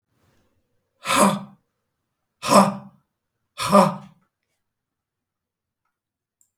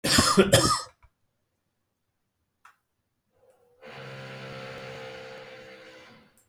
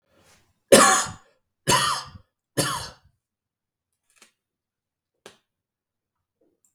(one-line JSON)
{"exhalation_length": "6.6 s", "exhalation_amplitude": 31314, "exhalation_signal_mean_std_ratio": 0.28, "cough_length": "6.5 s", "cough_amplitude": 21100, "cough_signal_mean_std_ratio": 0.33, "three_cough_length": "6.7 s", "three_cough_amplitude": 32768, "three_cough_signal_mean_std_ratio": 0.26, "survey_phase": "beta (2021-08-13 to 2022-03-07)", "age": "65+", "gender": "Male", "wearing_mask": "No", "symptom_none": true, "smoker_status": "Never smoked", "respiratory_condition_asthma": false, "respiratory_condition_other": false, "recruitment_source": "REACT", "submission_delay": "2 days", "covid_test_result": "Negative", "covid_test_method": "RT-qPCR", "influenza_a_test_result": "Negative", "influenza_b_test_result": "Negative"}